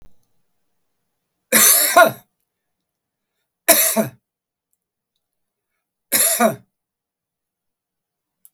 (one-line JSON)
{"three_cough_length": "8.5 s", "three_cough_amplitude": 32768, "three_cough_signal_mean_std_ratio": 0.3, "survey_phase": "beta (2021-08-13 to 2022-03-07)", "age": "65+", "gender": "Male", "wearing_mask": "No", "symptom_none": true, "smoker_status": "Ex-smoker", "respiratory_condition_asthma": false, "respiratory_condition_other": true, "recruitment_source": "REACT", "submission_delay": "1 day", "covid_test_result": "Negative", "covid_test_method": "RT-qPCR", "influenza_a_test_result": "Negative", "influenza_b_test_result": "Negative"}